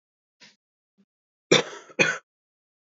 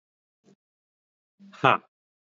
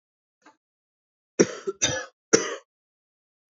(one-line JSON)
{"cough_length": "3.0 s", "cough_amplitude": 23155, "cough_signal_mean_std_ratio": 0.23, "exhalation_length": "2.3 s", "exhalation_amplitude": 25363, "exhalation_signal_mean_std_ratio": 0.16, "three_cough_length": "3.5 s", "three_cough_amplitude": 27700, "three_cough_signal_mean_std_ratio": 0.26, "survey_phase": "alpha (2021-03-01 to 2021-08-12)", "age": "18-44", "gender": "Male", "wearing_mask": "No", "symptom_cough_any": true, "symptom_fever_high_temperature": true, "symptom_headache": true, "symptom_onset": "3 days", "smoker_status": "Never smoked", "respiratory_condition_asthma": false, "respiratory_condition_other": false, "recruitment_source": "Test and Trace", "submission_delay": "2 days", "covid_test_result": "Positive", "covid_test_method": "RT-qPCR", "covid_ct_value": 18.1, "covid_ct_gene": "ORF1ab gene", "covid_ct_mean": 18.7, "covid_viral_load": "740000 copies/ml", "covid_viral_load_category": "Low viral load (10K-1M copies/ml)"}